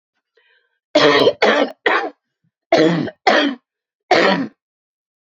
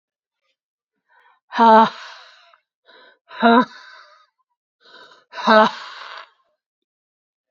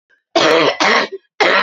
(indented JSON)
{
  "three_cough_length": "5.3 s",
  "three_cough_amplitude": 29806,
  "three_cough_signal_mean_std_ratio": 0.49,
  "exhalation_length": "7.5 s",
  "exhalation_amplitude": 29524,
  "exhalation_signal_mean_std_ratio": 0.29,
  "cough_length": "1.6 s",
  "cough_amplitude": 32151,
  "cough_signal_mean_std_ratio": 0.69,
  "survey_phase": "beta (2021-08-13 to 2022-03-07)",
  "age": "18-44",
  "gender": "Female",
  "wearing_mask": "No",
  "symptom_cough_any": true,
  "symptom_runny_or_blocked_nose": true,
  "symptom_shortness_of_breath": true,
  "symptom_sore_throat": true,
  "symptom_abdominal_pain": true,
  "symptom_fatigue": true,
  "symptom_fever_high_temperature": true,
  "symptom_headache": true,
  "symptom_change_to_sense_of_smell_or_taste": true,
  "symptom_loss_of_taste": true,
  "symptom_onset": "4 days",
  "smoker_status": "Never smoked",
  "respiratory_condition_asthma": false,
  "respiratory_condition_other": false,
  "recruitment_source": "Test and Trace",
  "submission_delay": "3 days",
  "covid_test_result": "Positive",
  "covid_test_method": "RT-qPCR",
  "covid_ct_value": 13.7,
  "covid_ct_gene": "ORF1ab gene",
  "covid_ct_mean": 14.4,
  "covid_viral_load": "19000000 copies/ml",
  "covid_viral_load_category": "High viral load (>1M copies/ml)"
}